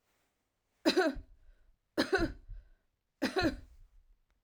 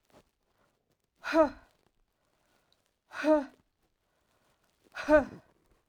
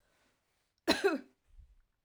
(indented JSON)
{
  "three_cough_length": "4.4 s",
  "three_cough_amplitude": 6044,
  "three_cough_signal_mean_std_ratio": 0.38,
  "exhalation_length": "5.9 s",
  "exhalation_amplitude": 9491,
  "exhalation_signal_mean_std_ratio": 0.27,
  "cough_length": "2.0 s",
  "cough_amplitude": 6849,
  "cough_signal_mean_std_ratio": 0.29,
  "survey_phase": "alpha (2021-03-01 to 2021-08-12)",
  "age": "45-64",
  "gender": "Female",
  "wearing_mask": "No",
  "symptom_none": true,
  "smoker_status": "Ex-smoker",
  "respiratory_condition_asthma": false,
  "respiratory_condition_other": false,
  "recruitment_source": "REACT",
  "submission_delay": "1 day",
  "covid_test_result": "Negative",
  "covid_test_method": "RT-qPCR"
}